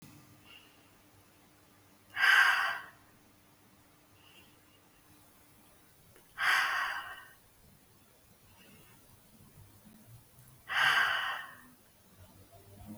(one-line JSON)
{"exhalation_length": "13.0 s", "exhalation_amplitude": 7926, "exhalation_signal_mean_std_ratio": 0.35, "survey_phase": "beta (2021-08-13 to 2022-03-07)", "age": "18-44", "gender": "Female", "wearing_mask": "No", "symptom_runny_or_blocked_nose": true, "symptom_onset": "7 days", "smoker_status": "Never smoked", "respiratory_condition_asthma": false, "respiratory_condition_other": false, "recruitment_source": "REACT", "submission_delay": "1 day", "covid_test_result": "Negative", "covid_test_method": "RT-qPCR", "influenza_a_test_result": "Negative", "influenza_b_test_result": "Negative"}